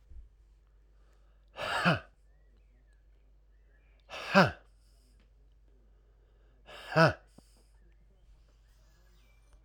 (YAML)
exhalation_length: 9.6 s
exhalation_amplitude: 12762
exhalation_signal_mean_std_ratio: 0.25
survey_phase: alpha (2021-03-01 to 2021-08-12)
age: 45-64
gender: Male
wearing_mask: 'No'
symptom_cough_any: true
symptom_fatigue: true
symptom_change_to_sense_of_smell_or_taste: true
symptom_onset: 3 days
smoker_status: Ex-smoker
respiratory_condition_asthma: false
respiratory_condition_other: false
recruitment_source: Test and Trace
submission_delay: 2 days
covid_test_result: Positive
covid_test_method: RT-qPCR